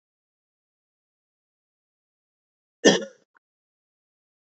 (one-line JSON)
{"cough_length": "4.4 s", "cough_amplitude": 26316, "cough_signal_mean_std_ratio": 0.14, "survey_phase": "beta (2021-08-13 to 2022-03-07)", "age": "45-64", "gender": "Female", "wearing_mask": "No", "symptom_cough_any": true, "symptom_fatigue": true, "symptom_headache": true, "symptom_change_to_sense_of_smell_or_taste": true, "symptom_onset": "4 days", "smoker_status": "Never smoked", "respiratory_condition_asthma": false, "respiratory_condition_other": false, "recruitment_source": "Test and Trace", "submission_delay": "2 days", "covid_test_result": "Positive", "covid_test_method": "RT-qPCR"}